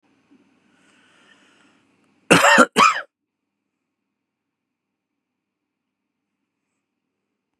{
  "cough_length": "7.6 s",
  "cough_amplitude": 32767,
  "cough_signal_mean_std_ratio": 0.21,
  "survey_phase": "beta (2021-08-13 to 2022-03-07)",
  "age": "45-64",
  "gender": "Male",
  "wearing_mask": "No",
  "symptom_runny_or_blocked_nose": true,
  "symptom_headache": true,
  "symptom_onset": "6 days",
  "smoker_status": "Ex-smoker",
  "respiratory_condition_asthma": false,
  "respiratory_condition_other": false,
  "recruitment_source": "REACT",
  "submission_delay": "6 days",
  "covid_test_result": "Negative",
  "covid_test_method": "RT-qPCR",
  "influenza_a_test_result": "Negative",
  "influenza_b_test_result": "Negative"
}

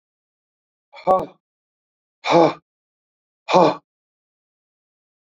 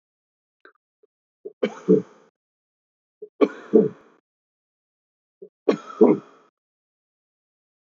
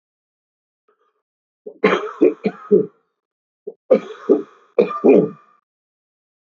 {
  "exhalation_length": "5.4 s",
  "exhalation_amplitude": 26340,
  "exhalation_signal_mean_std_ratio": 0.27,
  "three_cough_length": "7.9 s",
  "three_cough_amplitude": 24088,
  "three_cough_signal_mean_std_ratio": 0.23,
  "cough_length": "6.6 s",
  "cough_amplitude": 26431,
  "cough_signal_mean_std_ratio": 0.33,
  "survey_phase": "beta (2021-08-13 to 2022-03-07)",
  "age": "45-64",
  "gender": "Male",
  "wearing_mask": "No",
  "symptom_cough_any": true,
  "smoker_status": "Ex-smoker",
  "respiratory_condition_asthma": false,
  "respiratory_condition_other": false,
  "recruitment_source": "Test and Trace",
  "submission_delay": "1 day",
  "covid_test_result": "Negative",
  "covid_test_method": "RT-qPCR"
}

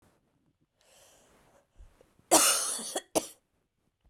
{
  "cough_length": "4.1 s",
  "cough_amplitude": 14935,
  "cough_signal_mean_std_ratio": 0.29,
  "survey_phase": "beta (2021-08-13 to 2022-03-07)",
  "age": "18-44",
  "gender": "Female",
  "wearing_mask": "No",
  "symptom_cough_any": true,
  "symptom_new_continuous_cough": true,
  "symptom_runny_or_blocked_nose": true,
  "symptom_shortness_of_breath": true,
  "symptom_sore_throat": true,
  "symptom_abdominal_pain": true,
  "symptom_fatigue": true,
  "symptom_headache": true,
  "smoker_status": "Never smoked",
  "respiratory_condition_asthma": false,
  "respiratory_condition_other": false,
  "recruitment_source": "Test and Trace",
  "submission_delay": "2 days",
  "covid_test_result": "Positive",
  "covid_test_method": "RT-qPCR",
  "covid_ct_value": 26.6,
  "covid_ct_gene": "ORF1ab gene",
  "covid_ct_mean": 27.4,
  "covid_viral_load": "1000 copies/ml",
  "covid_viral_load_category": "Minimal viral load (< 10K copies/ml)"
}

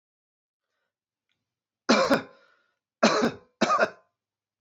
{
  "cough_length": "4.6 s",
  "cough_amplitude": 15500,
  "cough_signal_mean_std_ratio": 0.34,
  "survey_phase": "beta (2021-08-13 to 2022-03-07)",
  "age": "45-64",
  "gender": "Male",
  "wearing_mask": "No",
  "symptom_fatigue": true,
  "symptom_onset": "12 days",
  "smoker_status": "Never smoked",
  "respiratory_condition_asthma": false,
  "respiratory_condition_other": false,
  "recruitment_source": "REACT",
  "submission_delay": "2 days",
  "covid_test_result": "Positive",
  "covid_test_method": "RT-qPCR",
  "covid_ct_value": 32.0,
  "covid_ct_gene": "N gene",
  "influenza_a_test_result": "Negative",
  "influenza_b_test_result": "Negative"
}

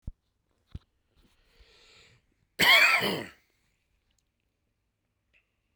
{
  "cough_length": "5.8 s",
  "cough_amplitude": 14269,
  "cough_signal_mean_std_ratio": 0.26,
  "survey_phase": "beta (2021-08-13 to 2022-03-07)",
  "age": "18-44",
  "gender": "Male",
  "wearing_mask": "No",
  "symptom_cough_any": true,
  "symptom_sore_throat": true,
  "smoker_status": "Never smoked",
  "respiratory_condition_asthma": true,
  "respiratory_condition_other": false,
  "recruitment_source": "Test and Trace",
  "submission_delay": "1 day",
  "covid_test_result": "Positive",
  "covid_test_method": "RT-qPCR",
  "covid_ct_value": 12.8,
  "covid_ct_gene": "N gene",
  "covid_ct_mean": 14.2,
  "covid_viral_load": "22000000 copies/ml",
  "covid_viral_load_category": "High viral load (>1M copies/ml)"
}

